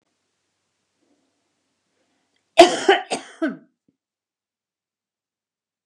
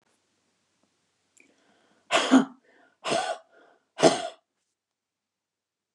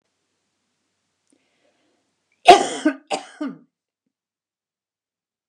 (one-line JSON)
{"cough_length": "5.9 s", "cough_amplitude": 32768, "cough_signal_mean_std_ratio": 0.19, "exhalation_length": "5.9 s", "exhalation_amplitude": 22671, "exhalation_signal_mean_std_ratio": 0.26, "three_cough_length": "5.5 s", "three_cough_amplitude": 32768, "three_cough_signal_mean_std_ratio": 0.18, "survey_phase": "beta (2021-08-13 to 2022-03-07)", "age": "65+", "gender": "Female", "wearing_mask": "No", "symptom_none": true, "smoker_status": "Never smoked", "respiratory_condition_asthma": true, "respiratory_condition_other": false, "recruitment_source": "REACT", "submission_delay": "1 day", "covid_test_result": "Negative", "covid_test_method": "RT-qPCR", "influenza_a_test_result": "Negative", "influenza_b_test_result": "Negative"}